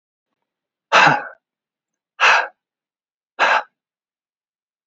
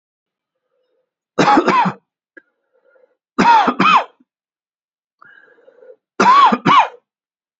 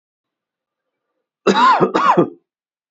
{"exhalation_length": "4.9 s", "exhalation_amplitude": 29034, "exhalation_signal_mean_std_ratio": 0.31, "three_cough_length": "7.6 s", "three_cough_amplitude": 30011, "three_cough_signal_mean_std_ratio": 0.41, "cough_length": "2.9 s", "cough_amplitude": 29331, "cough_signal_mean_std_ratio": 0.42, "survey_phase": "beta (2021-08-13 to 2022-03-07)", "age": "18-44", "gender": "Male", "wearing_mask": "Yes", "symptom_cough_any": true, "symptom_runny_or_blocked_nose": true, "symptom_sore_throat": true, "symptom_fatigue": true, "symptom_fever_high_temperature": true, "symptom_headache": true, "symptom_other": true, "symptom_onset": "3 days", "smoker_status": "Never smoked", "respiratory_condition_asthma": false, "respiratory_condition_other": false, "recruitment_source": "Test and Trace", "submission_delay": "2 days", "covid_test_result": "Positive", "covid_test_method": "RT-qPCR"}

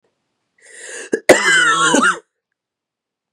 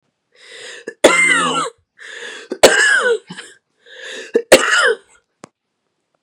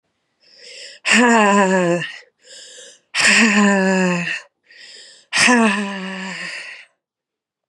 {"cough_length": "3.3 s", "cough_amplitude": 32768, "cough_signal_mean_std_ratio": 0.44, "three_cough_length": "6.2 s", "three_cough_amplitude": 32768, "three_cough_signal_mean_std_ratio": 0.45, "exhalation_length": "7.7 s", "exhalation_amplitude": 31441, "exhalation_signal_mean_std_ratio": 0.55, "survey_phase": "beta (2021-08-13 to 2022-03-07)", "age": "18-44", "gender": "Female", "wearing_mask": "No", "symptom_cough_any": true, "symptom_runny_or_blocked_nose": true, "symptom_shortness_of_breath": true, "symptom_sore_throat": true, "symptom_fatigue": true, "symptom_onset": "5 days", "smoker_status": "Never smoked", "respiratory_condition_asthma": false, "respiratory_condition_other": false, "recruitment_source": "Test and Trace", "submission_delay": "1 day", "covid_test_result": "Negative", "covid_test_method": "RT-qPCR"}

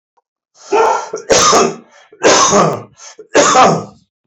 {"three_cough_length": "4.3 s", "three_cough_amplitude": 32767, "three_cough_signal_mean_std_ratio": 0.61, "survey_phase": "beta (2021-08-13 to 2022-03-07)", "age": "45-64", "gender": "Male", "wearing_mask": "No", "symptom_none": true, "smoker_status": "Ex-smoker", "respiratory_condition_asthma": false, "respiratory_condition_other": false, "recruitment_source": "REACT", "submission_delay": "2 days", "covid_test_result": "Negative", "covid_test_method": "RT-qPCR", "influenza_a_test_result": "Negative", "influenza_b_test_result": "Negative"}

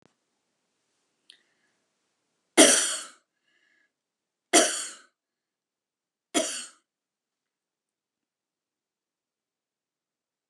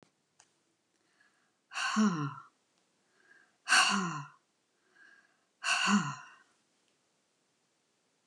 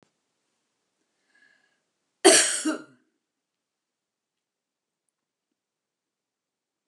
{"three_cough_length": "10.5 s", "three_cough_amplitude": 25603, "three_cough_signal_mean_std_ratio": 0.2, "exhalation_length": "8.3 s", "exhalation_amplitude": 8897, "exhalation_signal_mean_std_ratio": 0.35, "cough_length": "6.9 s", "cough_amplitude": 26348, "cough_signal_mean_std_ratio": 0.18, "survey_phase": "beta (2021-08-13 to 2022-03-07)", "age": "65+", "gender": "Female", "wearing_mask": "No", "symptom_none": true, "smoker_status": "Never smoked", "respiratory_condition_asthma": false, "respiratory_condition_other": false, "recruitment_source": "REACT", "submission_delay": "9 days", "covid_test_result": "Negative", "covid_test_method": "RT-qPCR"}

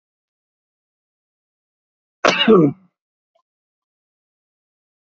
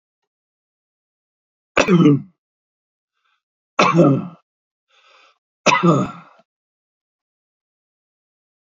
{"cough_length": "5.1 s", "cough_amplitude": 28713, "cough_signal_mean_std_ratio": 0.23, "three_cough_length": "8.8 s", "three_cough_amplitude": 29869, "three_cough_signal_mean_std_ratio": 0.3, "survey_phase": "alpha (2021-03-01 to 2021-08-12)", "age": "65+", "gender": "Male", "wearing_mask": "No", "symptom_none": true, "smoker_status": "Current smoker (e-cigarettes or vapes only)", "respiratory_condition_asthma": false, "respiratory_condition_other": false, "recruitment_source": "REACT", "submission_delay": "4 days", "covid_test_result": "Negative", "covid_test_method": "RT-qPCR"}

